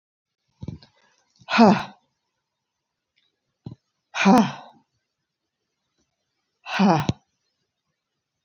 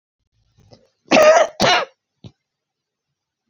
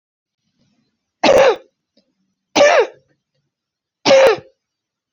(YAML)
exhalation_length: 8.4 s
exhalation_amplitude: 26839
exhalation_signal_mean_std_ratio: 0.27
cough_length: 3.5 s
cough_amplitude: 27483
cough_signal_mean_std_ratio: 0.34
three_cough_length: 5.1 s
three_cough_amplitude: 30797
three_cough_signal_mean_std_ratio: 0.37
survey_phase: beta (2021-08-13 to 2022-03-07)
age: 65+
gender: Female
wearing_mask: 'No'
symptom_cough_any: true
smoker_status: Never smoked
respiratory_condition_asthma: false
respiratory_condition_other: false
recruitment_source: REACT
submission_delay: 2 days
covid_test_result: Negative
covid_test_method: RT-qPCR
influenza_a_test_result: Negative
influenza_b_test_result: Negative